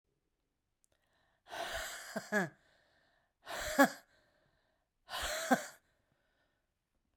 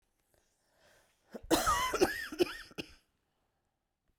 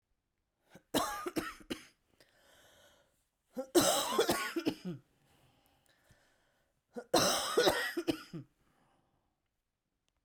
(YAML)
exhalation_length: 7.2 s
exhalation_amplitude: 6925
exhalation_signal_mean_std_ratio: 0.3
cough_length: 4.2 s
cough_amplitude: 6389
cough_signal_mean_std_ratio: 0.36
three_cough_length: 10.2 s
three_cough_amplitude: 7154
three_cough_signal_mean_std_ratio: 0.38
survey_phase: beta (2021-08-13 to 2022-03-07)
age: 45-64
gender: Female
wearing_mask: 'No'
symptom_cough_any: true
symptom_new_continuous_cough: true
symptom_runny_or_blocked_nose: true
symptom_shortness_of_breath: true
symptom_sore_throat: true
symptom_abdominal_pain: true
symptom_fatigue: true
symptom_headache: true
symptom_change_to_sense_of_smell_or_taste: true
symptom_onset: 5 days
smoker_status: Never smoked
respiratory_condition_asthma: false
respiratory_condition_other: false
recruitment_source: Test and Trace
submission_delay: 2 days
covid_test_result: Positive
covid_test_method: RT-qPCR
covid_ct_value: 12.2
covid_ct_gene: ORF1ab gene
covid_ct_mean: 12.7
covid_viral_load: 69000000 copies/ml
covid_viral_load_category: High viral load (>1M copies/ml)